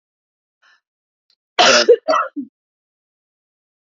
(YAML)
cough_length: 3.8 s
cough_amplitude: 31075
cough_signal_mean_std_ratio: 0.3
survey_phase: beta (2021-08-13 to 2022-03-07)
age: 18-44
gender: Female
wearing_mask: 'No'
symptom_none: true
symptom_onset: 11 days
smoker_status: Never smoked
respiratory_condition_asthma: false
respiratory_condition_other: false
recruitment_source: REACT
submission_delay: -1 day
covid_test_result: Negative
covid_test_method: RT-qPCR
influenza_a_test_result: Negative
influenza_b_test_result: Negative